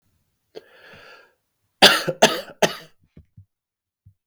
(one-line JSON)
{"three_cough_length": "4.3 s", "three_cough_amplitude": 32768, "three_cough_signal_mean_std_ratio": 0.24, "survey_phase": "beta (2021-08-13 to 2022-03-07)", "age": "18-44", "gender": "Male", "wearing_mask": "No", "symptom_runny_or_blocked_nose": true, "symptom_fatigue": true, "smoker_status": "Never smoked", "respiratory_condition_asthma": false, "respiratory_condition_other": false, "recruitment_source": "Test and Trace", "submission_delay": "0 days", "covid_test_result": "Negative", "covid_test_method": "LFT"}